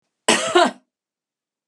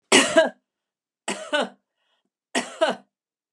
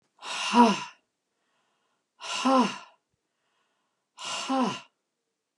{
  "cough_length": "1.7 s",
  "cough_amplitude": 31931,
  "cough_signal_mean_std_ratio": 0.36,
  "three_cough_length": "3.5 s",
  "three_cough_amplitude": 25522,
  "three_cough_signal_mean_std_ratio": 0.35,
  "exhalation_length": "5.6 s",
  "exhalation_amplitude": 19587,
  "exhalation_signal_mean_std_ratio": 0.36,
  "survey_phase": "beta (2021-08-13 to 2022-03-07)",
  "age": "45-64",
  "gender": "Female",
  "wearing_mask": "No",
  "symptom_none": true,
  "smoker_status": "Never smoked",
  "respiratory_condition_asthma": false,
  "respiratory_condition_other": false,
  "recruitment_source": "REACT",
  "submission_delay": "2 days",
  "covid_test_result": "Negative",
  "covid_test_method": "RT-qPCR",
  "influenza_a_test_result": "Negative",
  "influenza_b_test_result": "Negative"
}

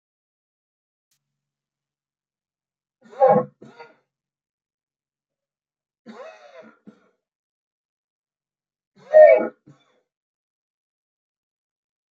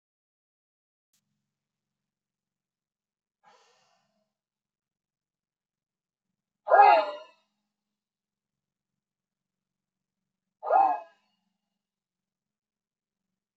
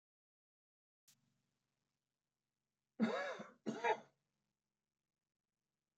{
  "three_cough_length": "12.1 s",
  "three_cough_amplitude": 26627,
  "three_cough_signal_mean_std_ratio": 0.17,
  "exhalation_length": "13.6 s",
  "exhalation_amplitude": 17171,
  "exhalation_signal_mean_std_ratio": 0.18,
  "cough_length": "6.0 s",
  "cough_amplitude": 1839,
  "cough_signal_mean_std_ratio": 0.25,
  "survey_phase": "beta (2021-08-13 to 2022-03-07)",
  "age": "65+",
  "gender": "Male",
  "wearing_mask": "No",
  "symptom_none": true,
  "smoker_status": "Never smoked",
  "respiratory_condition_asthma": false,
  "respiratory_condition_other": false,
  "recruitment_source": "REACT",
  "submission_delay": "2 days",
  "covid_test_result": "Negative",
  "covid_test_method": "RT-qPCR"
}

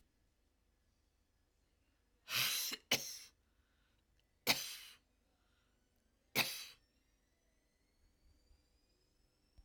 {
  "cough_length": "9.6 s",
  "cough_amplitude": 5211,
  "cough_signal_mean_std_ratio": 0.27,
  "survey_phase": "alpha (2021-03-01 to 2021-08-12)",
  "age": "65+",
  "gender": "Female",
  "wearing_mask": "No",
  "symptom_none": true,
  "smoker_status": "Never smoked",
  "respiratory_condition_asthma": false,
  "respiratory_condition_other": false,
  "recruitment_source": "REACT",
  "submission_delay": "2 days",
  "covid_test_result": "Negative",
  "covid_test_method": "RT-qPCR"
}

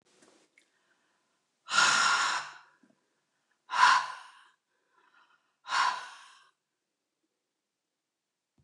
{
  "exhalation_length": "8.6 s",
  "exhalation_amplitude": 12327,
  "exhalation_signal_mean_std_ratio": 0.32,
  "survey_phase": "beta (2021-08-13 to 2022-03-07)",
  "age": "45-64",
  "gender": "Female",
  "wearing_mask": "Yes",
  "symptom_sore_throat": true,
  "symptom_headache": true,
  "smoker_status": "Never smoked",
  "respiratory_condition_asthma": true,
  "respiratory_condition_other": false,
  "recruitment_source": "REACT",
  "submission_delay": "2 days",
  "covid_test_result": "Negative",
  "covid_test_method": "RT-qPCR"
}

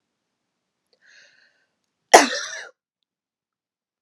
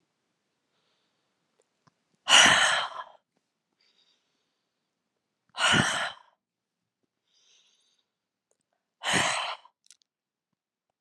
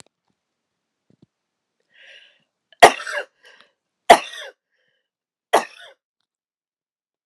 {
  "cough_length": "4.0 s",
  "cough_amplitude": 32768,
  "cough_signal_mean_std_ratio": 0.16,
  "exhalation_length": "11.0 s",
  "exhalation_amplitude": 19660,
  "exhalation_signal_mean_std_ratio": 0.28,
  "three_cough_length": "7.3 s",
  "three_cough_amplitude": 32768,
  "three_cough_signal_mean_std_ratio": 0.16,
  "survey_phase": "beta (2021-08-13 to 2022-03-07)",
  "age": "45-64",
  "gender": "Female",
  "wearing_mask": "No",
  "symptom_headache": true,
  "smoker_status": "Never smoked",
  "respiratory_condition_asthma": false,
  "respiratory_condition_other": false,
  "recruitment_source": "REACT",
  "submission_delay": "2 days",
  "covid_test_result": "Negative",
  "covid_test_method": "RT-qPCR",
  "influenza_a_test_result": "Negative",
  "influenza_b_test_result": "Negative"
}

